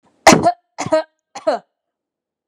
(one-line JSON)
{"three_cough_length": "2.5 s", "three_cough_amplitude": 32768, "three_cough_signal_mean_std_ratio": 0.34, "survey_phase": "beta (2021-08-13 to 2022-03-07)", "age": "18-44", "gender": "Female", "wearing_mask": "No", "symptom_none": true, "smoker_status": "Never smoked", "respiratory_condition_asthma": false, "respiratory_condition_other": false, "recruitment_source": "REACT", "submission_delay": "1 day", "covid_test_result": "Negative", "covid_test_method": "RT-qPCR"}